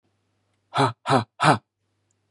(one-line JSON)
{"exhalation_length": "2.3 s", "exhalation_amplitude": 25267, "exhalation_signal_mean_std_ratio": 0.35, "survey_phase": "beta (2021-08-13 to 2022-03-07)", "age": "45-64", "gender": "Male", "wearing_mask": "No", "symptom_cough_any": true, "symptom_runny_or_blocked_nose": true, "symptom_sore_throat": true, "smoker_status": "Ex-smoker", "respiratory_condition_asthma": false, "respiratory_condition_other": false, "recruitment_source": "REACT", "submission_delay": "4 days", "covid_test_result": "Negative", "covid_test_method": "RT-qPCR"}